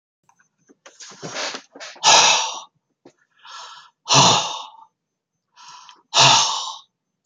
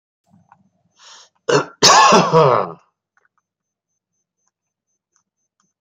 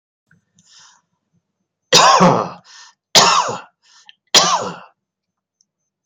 {"exhalation_length": "7.3 s", "exhalation_amplitude": 32767, "exhalation_signal_mean_std_ratio": 0.38, "cough_length": "5.8 s", "cough_amplitude": 32462, "cough_signal_mean_std_ratio": 0.33, "three_cough_length": "6.1 s", "three_cough_amplitude": 32158, "three_cough_signal_mean_std_ratio": 0.37, "survey_phase": "beta (2021-08-13 to 2022-03-07)", "age": "65+", "gender": "Male", "wearing_mask": "No", "symptom_none": true, "smoker_status": "Ex-smoker", "respiratory_condition_asthma": false, "respiratory_condition_other": false, "recruitment_source": "REACT", "submission_delay": "1 day", "covid_test_result": "Negative", "covid_test_method": "RT-qPCR", "influenza_a_test_result": "Negative", "influenza_b_test_result": "Negative"}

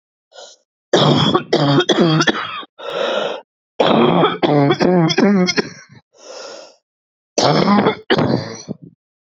{"cough_length": "9.4 s", "cough_amplitude": 32767, "cough_signal_mean_std_ratio": 0.63, "survey_phase": "beta (2021-08-13 to 2022-03-07)", "age": "45-64", "gender": "Female", "wearing_mask": "No", "symptom_cough_any": true, "symptom_runny_or_blocked_nose": true, "symptom_sore_throat": true, "symptom_abdominal_pain": true, "symptom_diarrhoea": true, "symptom_fatigue": true, "symptom_headache": true, "symptom_change_to_sense_of_smell_or_taste": true, "symptom_loss_of_taste": true, "symptom_other": true, "symptom_onset": "3 days", "smoker_status": "Current smoker (1 to 10 cigarettes per day)", "respiratory_condition_asthma": false, "respiratory_condition_other": false, "recruitment_source": "Test and Trace", "submission_delay": "1 day", "covid_test_result": "Positive", "covid_test_method": "RT-qPCR"}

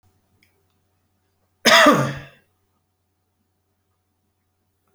{"cough_length": "4.9 s", "cough_amplitude": 30648, "cough_signal_mean_std_ratio": 0.24, "survey_phase": "beta (2021-08-13 to 2022-03-07)", "age": "65+", "gender": "Male", "wearing_mask": "No", "symptom_cough_any": true, "smoker_status": "Ex-smoker", "respiratory_condition_asthma": false, "respiratory_condition_other": false, "recruitment_source": "REACT", "submission_delay": "4 days", "covid_test_result": "Negative", "covid_test_method": "RT-qPCR"}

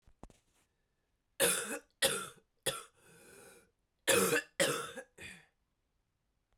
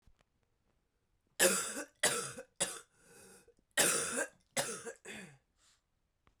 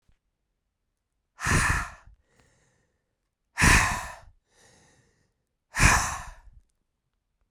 {"three_cough_length": "6.6 s", "three_cough_amplitude": 6878, "three_cough_signal_mean_std_ratio": 0.36, "cough_length": "6.4 s", "cough_amplitude": 7831, "cough_signal_mean_std_ratio": 0.38, "exhalation_length": "7.5 s", "exhalation_amplitude": 18391, "exhalation_signal_mean_std_ratio": 0.32, "survey_phase": "beta (2021-08-13 to 2022-03-07)", "age": "45-64", "gender": "Female", "wearing_mask": "No", "symptom_cough_any": true, "symptom_runny_or_blocked_nose": true, "symptom_fatigue": true, "symptom_fever_high_temperature": true, "symptom_headache": true, "symptom_other": true, "symptom_onset": "3 days", "smoker_status": "Ex-smoker", "respiratory_condition_asthma": true, "respiratory_condition_other": false, "recruitment_source": "Test and Trace", "submission_delay": "1 day", "covid_test_result": "Positive", "covid_test_method": "RT-qPCR", "covid_ct_value": 21.4, "covid_ct_gene": "E gene"}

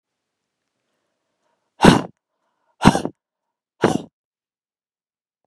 {"exhalation_length": "5.5 s", "exhalation_amplitude": 32768, "exhalation_signal_mean_std_ratio": 0.21, "survey_phase": "beta (2021-08-13 to 2022-03-07)", "age": "45-64", "gender": "Female", "wearing_mask": "No", "symptom_none": true, "smoker_status": "Never smoked", "respiratory_condition_asthma": false, "respiratory_condition_other": false, "recruitment_source": "REACT", "submission_delay": "0 days", "covid_test_result": "Negative", "covid_test_method": "RT-qPCR", "influenza_a_test_result": "Negative", "influenza_b_test_result": "Negative"}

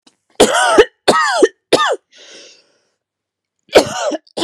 {"cough_length": "4.4 s", "cough_amplitude": 32768, "cough_signal_mean_std_ratio": 0.45, "survey_phase": "beta (2021-08-13 to 2022-03-07)", "age": "18-44", "gender": "Female", "wearing_mask": "No", "symptom_cough_any": true, "symptom_runny_or_blocked_nose": true, "symptom_sore_throat": true, "symptom_abdominal_pain": true, "symptom_fatigue": true, "symptom_headache": true, "smoker_status": "Never smoked", "respiratory_condition_asthma": false, "respiratory_condition_other": false, "recruitment_source": "Test and Trace", "submission_delay": "1 day", "covid_test_result": "Positive", "covid_test_method": "RT-qPCR", "covid_ct_value": 32.4, "covid_ct_gene": "ORF1ab gene", "covid_ct_mean": 33.4, "covid_viral_load": "11 copies/ml", "covid_viral_load_category": "Minimal viral load (< 10K copies/ml)"}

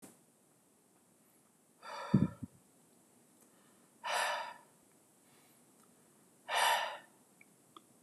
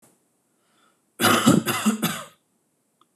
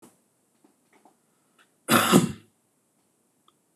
{"exhalation_length": "8.0 s", "exhalation_amplitude": 6676, "exhalation_signal_mean_std_ratio": 0.32, "three_cough_length": "3.2 s", "three_cough_amplitude": 25423, "three_cough_signal_mean_std_ratio": 0.4, "cough_length": "3.8 s", "cough_amplitude": 23492, "cough_signal_mean_std_ratio": 0.25, "survey_phase": "beta (2021-08-13 to 2022-03-07)", "age": "18-44", "gender": "Male", "wearing_mask": "No", "symptom_none": true, "smoker_status": "Never smoked", "respiratory_condition_asthma": false, "respiratory_condition_other": false, "recruitment_source": "REACT", "submission_delay": "1 day", "covid_test_result": "Negative", "covid_test_method": "RT-qPCR", "influenza_a_test_result": "Negative", "influenza_b_test_result": "Negative"}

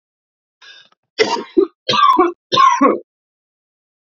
{"three_cough_length": "4.0 s", "three_cough_amplitude": 30790, "three_cough_signal_mean_std_ratio": 0.45, "survey_phase": "beta (2021-08-13 to 2022-03-07)", "age": "18-44", "gender": "Male", "wearing_mask": "No", "symptom_runny_or_blocked_nose": true, "symptom_shortness_of_breath": true, "symptom_fatigue": true, "symptom_fever_high_temperature": true, "symptom_headache": true, "symptom_onset": "5 days", "smoker_status": "Never smoked", "respiratory_condition_asthma": false, "respiratory_condition_other": false, "recruitment_source": "Test and Trace", "submission_delay": "1 day", "covid_test_result": "Positive", "covid_test_method": "RT-qPCR", "covid_ct_value": 18.6, "covid_ct_gene": "ORF1ab gene"}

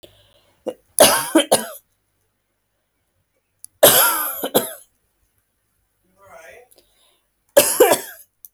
{"three_cough_length": "8.5 s", "three_cough_amplitude": 32768, "three_cough_signal_mean_std_ratio": 0.32, "survey_phase": "alpha (2021-03-01 to 2021-08-12)", "age": "18-44", "gender": "Female", "wearing_mask": "No", "symptom_none": true, "smoker_status": "Never smoked", "respiratory_condition_asthma": false, "respiratory_condition_other": false, "recruitment_source": "REACT", "submission_delay": "2 days", "covid_test_result": "Negative", "covid_test_method": "RT-qPCR"}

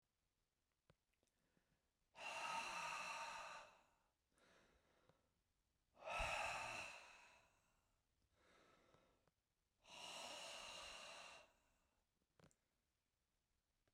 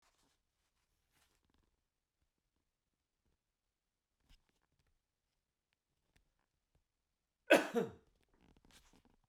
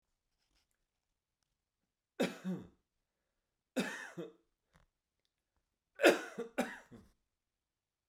{"exhalation_length": "13.9 s", "exhalation_amplitude": 635, "exhalation_signal_mean_std_ratio": 0.45, "cough_length": "9.3 s", "cough_amplitude": 6265, "cough_signal_mean_std_ratio": 0.13, "three_cough_length": "8.1 s", "three_cough_amplitude": 9353, "three_cough_signal_mean_std_ratio": 0.23, "survey_phase": "beta (2021-08-13 to 2022-03-07)", "age": "45-64", "gender": "Male", "wearing_mask": "No", "symptom_none": true, "smoker_status": "Ex-smoker", "respiratory_condition_asthma": true, "respiratory_condition_other": false, "recruitment_source": "REACT", "submission_delay": "2 days", "covid_test_result": "Negative", "covid_test_method": "RT-qPCR"}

